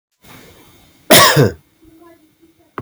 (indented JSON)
{
  "cough_length": "2.8 s",
  "cough_amplitude": 32768,
  "cough_signal_mean_std_ratio": 0.33,
  "survey_phase": "beta (2021-08-13 to 2022-03-07)",
  "age": "18-44",
  "gender": "Male",
  "wearing_mask": "No",
  "symptom_runny_or_blocked_nose": true,
  "symptom_fatigue": true,
  "symptom_headache": true,
  "symptom_change_to_sense_of_smell_or_taste": true,
  "smoker_status": "Never smoked",
  "respiratory_condition_asthma": false,
  "respiratory_condition_other": false,
  "recruitment_source": "Test and Trace",
  "submission_delay": "0 days",
  "covid_test_result": "Positive",
  "covid_test_method": "LFT"
}